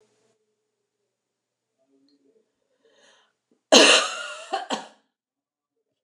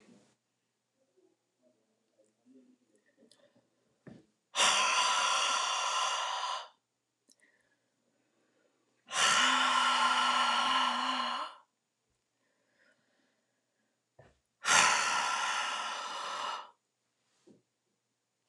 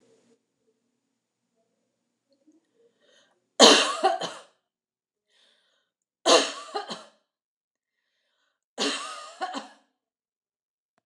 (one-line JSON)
{"cough_length": "6.0 s", "cough_amplitude": 29204, "cough_signal_mean_std_ratio": 0.23, "exhalation_length": "18.5 s", "exhalation_amplitude": 11737, "exhalation_signal_mean_std_ratio": 0.49, "three_cough_length": "11.1 s", "three_cough_amplitude": 29203, "three_cough_signal_mean_std_ratio": 0.24, "survey_phase": "beta (2021-08-13 to 2022-03-07)", "age": "45-64", "gender": "Female", "wearing_mask": "No", "symptom_none": true, "smoker_status": "Never smoked", "respiratory_condition_asthma": false, "respiratory_condition_other": false, "recruitment_source": "REACT", "submission_delay": "2 days", "covid_test_result": "Negative", "covid_test_method": "RT-qPCR"}